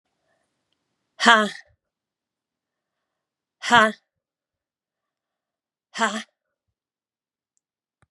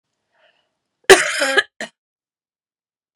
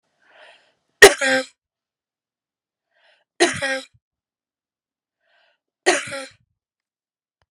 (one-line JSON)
{"exhalation_length": "8.1 s", "exhalation_amplitude": 32052, "exhalation_signal_mean_std_ratio": 0.19, "cough_length": "3.2 s", "cough_amplitude": 32768, "cough_signal_mean_std_ratio": 0.25, "three_cough_length": "7.5 s", "three_cough_amplitude": 32768, "three_cough_signal_mean_std_ratio": 0.21, "survey_phase": "beta (2021-08-13 to 2022-03-07)", "age": "65+", "gender": "Female", "wearing_mask": "No", "symptom_cough_any": true, "symptom_runny_or_blocked_nose": true, "smoker_status": "Never smoked", "respiratory_condition_asthma": false, "respiratory_condition_other": false, "recruitment_source": "Test and Trace", "submission_delay": "2 days", "covid_test_result": "Positive", "covid_test_method": "RT-qPCR", "covid_ct_value": 14.5, "covid_ct_gene": "ORF1ab gene", "covid_ct_mean": 15.0, "covid_viral_load": "12000000 copies/ml", "covid_viral_load_category": "High viral load (>1M copies/ml)"}